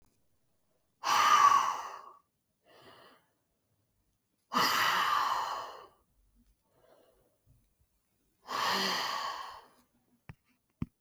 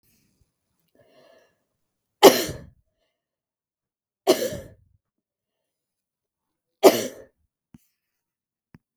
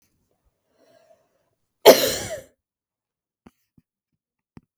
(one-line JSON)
{"exhalation_length": "11.0 s", "exhalation_amplitude": 7900, "exhalation_signal_mean_std_ratio": 0.41, "three_cough_length": "9.0 s", "three_cough_amplitude": 32768, "three_cough_signal_mean_std_ratio": 0.17, "cough_length": "4.8 s", "cough_amplitude": 32768, "cough_signal_mean_std_ratio": 0.17, "survey_phase": "beta (2021-08-13 to 2022-03-07)", "age": "18-44", "gender": "Female", "wearing_mask": "No", "symptom_none": true, "smoker_status": "Never smoked", "respiratory_condition_asthma": false, "respiratory_condition_other": false, "recruitment_source": "Test and Trace", "submission_delay": "1 day", "covid_test_result": "Negative", "covid_test_method": "RT-qPCR"}